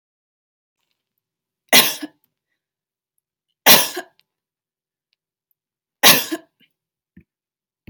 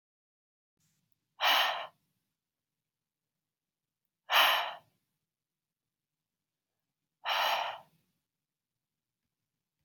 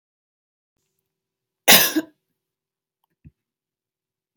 {"three_cough_length": "7.9 s", "three_cough_amplitude": 32768, "three_cough_signal_mean_std_ratio": 0.22, "exhalation_length": "9.8 s", "exhalation_amplitude": 8976, "exhalation_signal_mean_std_ratio": 0.28, "cough_length": "4.4 s", "cough_amplitude": 32768, "cough_signal_mean_std_ratio": 0.19, "survey_phase": "beta (2021-08-13 to 2022-03-07)", "age": "18-44", "gender": "Female", "wearing_mask": "No", "symptom_none": true, "smoker_status": "Never smoked", "respiratory_condition_asthma": false, "respiratory_condition_other": false, "recruitment_source": "REACT", "submission_delay": "2 days", "covid_test_result": "Negative", "covid_test_method": "RT-qPCR"}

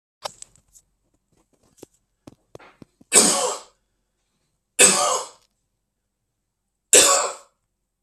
{"three_cough_length": "8.0 s", "three_cough_amplitude": 32768, "three_cough_signal_mean_std_ratio": 0.29, "survey_phase": "beta (2021-08-13 to 2022-03-07)", "age": "45-64", "gender": "Male", "wearing_mask": "No", "symptom_none": true, "smoker_status": "Current smoker (1 to 10 cigarettes per day)", "respiratory_condition_asthma": false, "respiratory_condition_other": false, "recruitment_source": "REACT", "submission_delay": "2 days", "covid_test_result": "Negative", "covid_test_method": "RT-qPCR", "influenza_a_test_result": "Negative", "influenza_b_test_result": "Negative"}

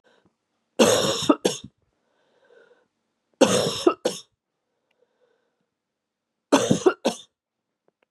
{"three_cough_length": "8.1 s", "three_cough_amplitude": 26468, "three_cough_signal_mean_std_ratio": 0.32, "survey_phase": "beta (2021-08-13 to 2022-03-07)", "age": "45-64", "gender": "Female", "wearing_mask": "No", "symptom_cough_any": true, "symptom_runny_or_blocked_nose": true, "symptom_sore_throat": true, "symptom_abdominal_pain": true, "symptom_diarrhoea": true, "symptom_fatigue": true, "symptom_fever_high_temperature": true, "symptom_headache": true, "symptom_loss_of_taste": true, "smoker_status": "Never smoked", "respiratory_condition_asthma": false, "respiratory_condition_other": false, "recruitment_source": "REACT", "submission_delay": "7 days", "covid_test_result": "Negative", "covid_test_method": "RT-qPCR", "influenza_a_test_result": "Negative", "influenza_b_test_result": "Negative"}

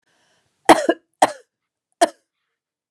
{"cough_length": "2.9 s", "cough_amplitude": 32768, "cough_signal_mean_std_ratio": 0.22, "survey_phase": "beta (2021-08-13 to 2022-03-07)", "age": "45-64", "gender": "Female", "wearing_mask": "No", "symptom_none": true, "smoker_status": "Ex-smoker", "respiratory_condition_asthma": false, "respiratory_condition_other": false, "recruitment_source": "REACT", "submission_delay": "2 days", "covid_test_result": "Negative", "covid_test_method": "RT-qPCR", "influenza_a_test_result": "Negative", "influenza_b_test_result": "Negative"}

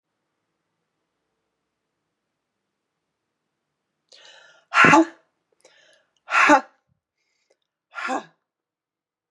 {"exhalation_length": "9.3 s", "exhalation_amplitude": 28484, "exhalation_signal_mean_std_ratio": 0.22, "survey_phase": "beta (2021-08-13 to 2022-03-07)", "age": "18-44", "gender": "Male", "wearing_mask": "No", "symptom_runny_or_blocked_nose": true, "symptom_fatigue": true, "symptom_onset": "5 days", "smoker_status": "Ex-smoker", "respiratory_condition_asthma": false, "respiratory_condition_other": false, "recruitment_source": "Test and Trace", "submission_delay": "2 days", "covid_test_result": "Positive", "covid_test_method": "ePCR"}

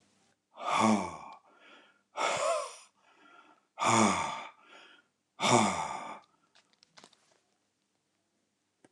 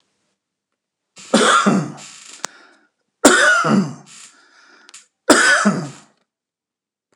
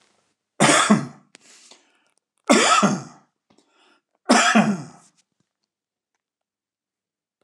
{"exhalation_length": "8.9 s", "exhalation_amplitude": 9856, "exhalation_signal_mean_std_ratio": 0.4, "three_cough_length": "7.2 s", "three_cough_amplitude": 29204, "three_cough_signal_mean_std_ratio": 0.42, "cough_length": "7.4 s", "cough_amplitude": 28760, "cough_signal_mean_std_ratio": 0.35, "survey_phase": "alpha (2021-03-01 to 2021-08-12)", "age": "65+", "gender": "Male", "wearing_mask": "No", "symptom_none": true, "smoker_status": "Ex-smoker", "respiratory_condition_asthma": false, "respiratory_condition_other": false, "recruitment_source": "REACT", "submission_delay": "1 day", "covid_test_result": "Negative", "covid_test_method": "RT-qPCR"}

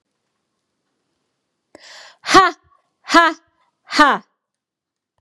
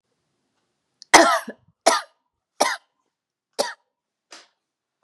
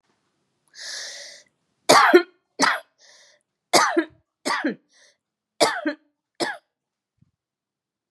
{"exhalation_length": "5.2 s", "exhalation_amplitude": 32768, "exhalation_signal_mean_std_ratio": 0.27, "cough_length": "5.0 s", "cough_amplitude": 32768, "cough_signal_mean_std_ratio": 0.25, "three_cough_length": "8.1 s", "three_cough_amplitude": 30314, "three_cough_signal_mean_std_ratio": 0.31, "survey_phase": "beta (2021-08-13 to 2022-03-07)", "age": "45-64", "gender": "Female", "wearing_mask": "No", "symptom_fatigue": true, "symptom_other": true, "symptom_onset": "5 days", "smoker_status": "Never smoked", "respiratory_condition_asthma": false, "respiratory_condition_other": false, "recruitment_source": "Test and Trace", "submission_delay": "2 days", "covid_test_result": "Positive", "covid_test_method": "RT-qPCR", "covid_ct_value": 25.8, "covid_ct_gene": "ORF1ab gene"}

